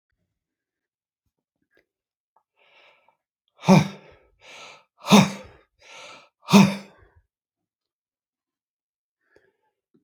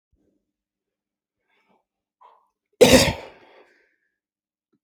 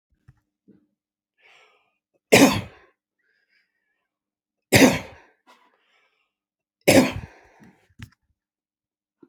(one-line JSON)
{"exhalation_length": "10.0 s", "exhalation_amplitude": 30792, "exhalation_signal_mean_std_ratio": 0.2, "cough_length": "4.8 s", "cough_amplitude": 27663, "cough_signal_mean_std_ratio": 0.2, "three_cough_length": "9.3 s", "three_cough_amplitude": 30124, "three_cough_signal_mean_std_ratio": 0.22, "survey_phase": "alpha (2021-03-01 to 2021-08-12)", "age": "65+", "gender": "Male", "wearing_mask": "No", "symptom_none": true, "smoker_status": "Never smoked", "respiratory_condition_asthma": false, "respiratory_condition_other": false, "recruitment_source": "REACT", "submission_delay": "2 days", "covid_test_result": "Negative", "covid_test_method": "RT-qPCR"}